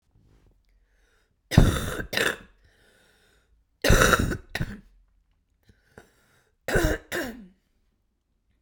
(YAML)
three_cough_length: 8.6 s
three_cough_amplitude: 29181
three_cough_signal_mean_std_ratio: 0.32
survey_phase: beta (2021-08-13 to 2022-03-07)
age: 18-44
gender: Female
wearing_mask: 'No'
symptom_cough_any: true
symptom_new_continuous_cough: true
symptom_fatigue: true
symptom_fever_high_temperature: true
symptom_headache: true
symptom_onset: 3 days
smoker_status: Ex-smoker
respiratory_condition_asthma: false
respiratory_condition_other: false
recruitment_source: Test and Trace
submission_delay: 1 day
covid_test_result: Positive
covid_test_method: RT-qPCR
covid_ct_value: 16.8
covid_ct_gene: ORF1ab gene
covid_ct_mean: 17.5
covid_viral_load: 1800000 copies/ml
covid_viral_load_category: High viral load (>1M copies/ml)